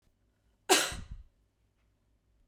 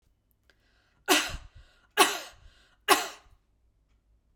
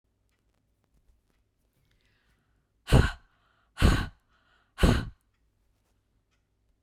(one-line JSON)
{"cough_length": "2.5 s", "cough_amplitude": 11945, "cough_signal_mean_std_ratio": 0.25, "three_cough_length": "4.4 s", "three_cough_amplitude": 19636, "three_cough_signal_mean_std_ratio": 0.28, "exhalation_length": "6.8 s", "exhalation_amplitude": 15323, "exhalation_signal_mean_std_ratio": 0.24, "survey_phase": "beta (2021-08-13 to 2022-03-07)", "age": "45-64", "gender": "Female", "wearing_mask": "No", "symptom_none": true, "smoker_status": "Never smoked", "respiratory_condition_asthma": false, "respiratory_condition_other": false, "recruitment_source": "REACT", "submission_delay": "1 day", "covid_test_result": "Negative", "covid_test_method": "RT-qPCR", "influenza_a_test_result": "Unknown/Void", "influenza_b_test_result": "Unknown/Void"}